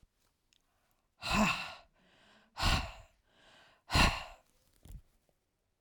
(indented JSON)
{
  "exhalation_length": "5.8 s",
  "exhalation_amplitude": 7138,
  "exhalation_signal_mean_std_ratio": 0.34,
  "survey_phase": "alpha (2021-03-01 to 2021-08-12)",
  "age": "65+",
  "gender": "Female",
  "wearing_mask": "No",
  "symptom_none": true,
  "smoker_status": "Current smoker (1 to 10 cigarettes per day)",
  "respiratory_condition_asthma": false,
  "respiratory_condition_other": false,
  "recruitment_source": "REACT",
  "submission_delay": "2 days",
  "covid_test_result": "Negative",
  "covid_test_method": "RT-qPCR"
}